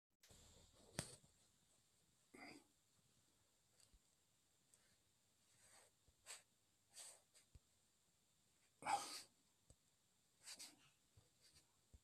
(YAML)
cough_length: 12.0 s
cough_amplitude: 1556
cough_signal_mean_std_ratio: 0.28
survey_phase: alpha (2021-03-01 to 2021-08-12)
age: 65+
gender: Male
wearing_mask: 'No'
symptom_none: true
smoker_status: Never smoked
respiratory_condition_asthma: false
respiratory_condition_other: false
recruitment_source: REACT
submission_delay: 1 day
covid_test_result: Negative
covid_test_method: RT-qPCR